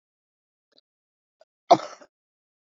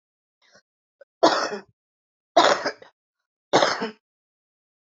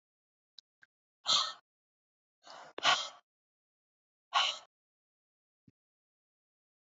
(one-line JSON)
{"cough_length": "2.7 s", "cough_amplitude": 22285, "cough_signal_mean_std_ratio": 0.13, "three_cough_length": "4.9 s", "three_cough_amplitude": 24843, "three_cough_signal_mean_std_ratio": 0.31, "exhalation_length": "7.0 s", "exhalation_amplitude": 6315, "exhalation_signal_mean_std_ratio": 0.24, "survey_phase": "beta (2021-08-13 to 2022-03-07)", "age": "45-64", "gender": "Female", "wearing_mask": "No", "symptom_none": true, "smoker_status": "Current smoker (1 to 10 cigarettes per day)", "respiratory_condition_asthma": false, "respiratory_condition_other": false, "recruitment_source": "REACT", "submission_delay": "2 days", "covid_test_result": "Negative", "covid_test_method": "RT-qPCR", "influenza_a_test_result": "Negative", "influenza_b_test_result": "Negative"}